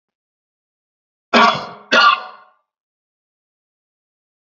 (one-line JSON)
{"cough_length": "4.5 s", "cough_amplitude": 30819, "cough_signal_mean_std_ratio": 0.28, "survey_phase": "beta (2021-08-13 to 2022-03-07)", "age": "18-44", "gender": "Male", "wearing_mask": "No", "symptom_runny_or_blocked_nose": true, "symptom_sore_throat": true, "symptom_fatigue": true, "symptom_headache": true, "smoker_status": "Never smoked", "respiratory_condition_asthma": false, "respiratory_condition_other": false, "recruitment_source": "Test and Trace", "submission_delay": "2 days", "covid_test_result": "Positive", "covid_test_method": "LFT"}